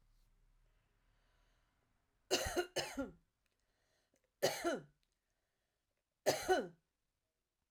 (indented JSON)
{
  "three_cough_length": "7.7 s",
  "three_cough_amplitude": 3430,
  "three_cough_signal_mean_std_ratio": 0.31,
  "survey_phase": "beta (2021-08-13 to 2022-03-07)",
  "age": "45-64",
  "gender": "Female",
  "wearing_mask": "No",
  "symptom_none": true,
  "smoker_status": "Ex-smoker",
  "respiratory_condition_asthma": false,
  "respiratory_condition_other": false,
  "recruitment_source": "REACT",
  "submission_delay": "2 days",
  "covid_test_result": "Negative",
  "covid_test_method": "RT-qPCR"
}